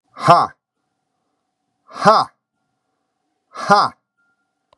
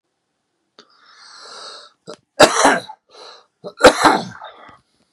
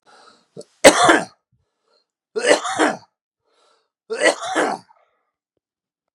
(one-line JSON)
{"exhalation_length": "4.8 s", "exhalation_amplitude": 32768, "exhalation_signal_mean_std_ratio": 0.29, "cough_length": "5.1 s", "cough_amplitude": 32768, "cough_signal_mean_std_ratio": 0.3, "three_cough_length": "6.1 s", "three_cough_amplitude": 32768, "three_cough_signal_mean_std_ratio": 0.33, "survey_phase": "beta (2021-08-13 to 2022-03-07)", "age": "45-64", "gender": "Male", "wearing_mask": "No", "symptom_none": true, "smoker_status": "Current smoker (11 or more cigarettes per day)", "respiratory_condition_asthma": false, "respiratory_condition_other": true, "recruitment_source": "REACT", "submission_delay": "11 days", "covid_test_result": "Negative", "covid_test_method": "RT-qPCR"}